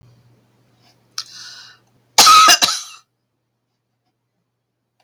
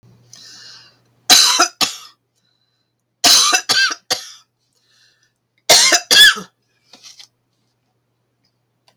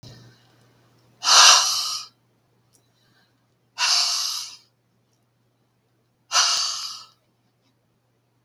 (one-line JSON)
{"cough_length": "5.0 s", "cough_amplitude": 32768, "cough_signal_mean_std_ratio": 0.29, "three_cough_length": "9.0 s", "three_cough_amplitude": 32768, "three_cough_signal_mean_std_ratio": 0.36, "exhalation_length": "8.4 s", "exhalation_amplitude": 32766, "exhalation_signal_mean_std_ratio": 0.34, "survey_phase": "beta (2021-08-13 to 2022-03-07)", "age": "65+", "gender": "Female", "wearing_mask": "No", "symptom_none": true, "smoker_status": "Never smoked", "respiratory_condition_asthma": false, "respiratory_condition_other": false, "recruitment_source": "REACT", "submission_delay": "2 days", "covid_test_result": "Negative", "covid_test_method": "RT-qPCR", "influenza_a_test_result": "Negative", "influenza_b_test_result": "Negative"}